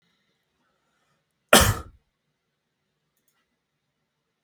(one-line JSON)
{"cough_length": "4.4 s", "cough_amplitude": 32766, "cough_signal_mean_std_ratio": 0.17, "survey_phase": "beta (2021-08-13 to 2022-03-07)", "age": "18-44", "gender": "Male", "wearing_mask": "No", "symptom_none": true, "smoker_status": "Never smoked", "respiratory_condition_asthma": false, "respiratory_condition_other": false, "recruitment_source": "REACT", "submission_delay": "1 day", "covid_test_result": "Negative", "covid_test_method": "RT-qPCR", "influenza_a_test_result": "Negative", "influenza_b_test_result": "Negative"}